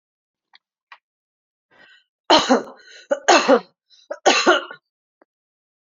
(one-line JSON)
{"three_cough_length": "6.0 s", "three_cough_amplitude": 30378, "three_cough_signal_mean_std_ratio": 0.32, "survey_phase": "beta (2021-08-13 to 2022-03-07)", "age": "45-64", "gender": "Female", "wearing_mask": "No", "symptom_cough_any": true, "symptom_runny_or_blocked_nose": true, "symptom_other": true, "smoker_status": "Never smoked", "respiratory_condition_asthma": false, "respiratory_condition_other": false, "recruitment_source": "Test and Trace", "submission_delay": "2 days", "covid_test_result": "Positive", "covid_test_method": "LFT"}